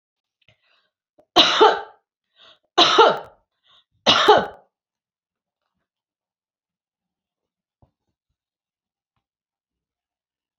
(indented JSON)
{
  "three_cough_length": "10.6 s",
  "three_cough_amplitude": 29597,
  "three_cough_signal_mean_std_ratio": 0.25,
  "survey_phase": "beta (2021-08-13 to 2022-03-07)",
  "age": "45-64",
  "gender": "Female",
  "wearing_mask": "No",
  "symptom_none": true,
  "smoker_status": "Never smoked",
  "respiratory_condition_asthma": false,
  "respiratory_condition_other": false,
  "recruitment_source": "REACT",
  "submission_delay": "1 day",
  "covid_test_result": "Negative",
  "covid_test_method": "RT-qPCR",
  "influenza_a_test_result": "Negative",
  "influenza_b_test_result": "Negative"
}